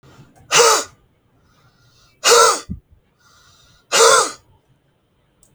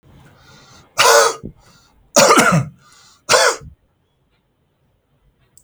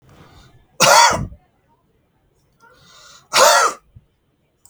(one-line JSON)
{"exhalation_length": "5.5 s", "exhalation_amplitude": 32768, "exhalation_signal_mean_std_ratio": 0.36, "three_cough_length": "5.6 s", "three_cough_amplitude": 32768, "three_cough_signal_mean_std_ratio": 0.38, "cough_length": "4.7 s", "cough_amplitude": 32768, "cough_signal_mean_std_ratio": 0.35, "survey_phase": "beta (2021-08-13 to 2022-03-07)", "age": "45-64", "gender": "Male", "wearing_mask": "No", "symptom_none": true, "smoker_status": "Ex-smoker", "respiratory_condition_asthma": false, "respiratory_condition_other": false, "recruitment_source": "REACT", "submission_delay": "3 days", "covid_test_result": "Negative", "covid_test_method": "RT-qPCR", "influenza_a_test_result": "Negative", "influenza_b_test_result": "Negative"}